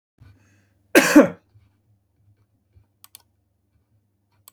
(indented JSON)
{
  "cough_length": "4.5 s",
  "cough_amplitude": 29453,
  "cough_signal_mean_std_ratio": 0.2,
  "survey_phase": "beta (2021-08-13 to 2022-03-07)",
  "age": "45-64",
  "gender": "Male",
  "wearing_mask": "No",
  "symptom_none": true,
  "smoker_status": "Ex-smoker",
  "respiratory_condition_asthma": false,
  "respiratory_condition_other": false,
  "recruitment_source": "REACT",
  "submission_delay": "2 days",
  "covid_test_result": "Negative",
  "covid_test_method": "RT-qPCR",
  "influenza_a_test_result": "Negative",
  "influenza_b_test_result": "Negative"
}